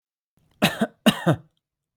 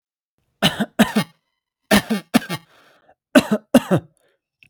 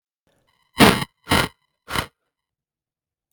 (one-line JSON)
{"cough_length": "2.0 s", "cough_amplitude": 29279, "cough_signal_mean_std_ratio": 0.34, "three_cough_length": "4.7 s", "three_cough_amplitude": 32768, "three_cough_signal_mean_std_ratio": 0.34, "exhalation_length": "3.3 s", "exhalation_amplitude": 32768, "exhalation_signal_mean_std_ratio": 0.27, "survey_phase": "beta (2021-08-13 to 2022-03-07)", "age": "18-44", "gender": "Male", "wearing_mask": "No", "symptom_none": true, "smoker_status": "Never smoked", "respiratory_condition_asthma": false, "respiratory_condition_other": false, "recruitment_source": "REACT", "submission_delay": "3 days", "covid_test_result": "Negative", "covid_test_method": "RT-qPCR", "influenza_a_test_result": "Negative", "influenza_b_test_result": "Negative"}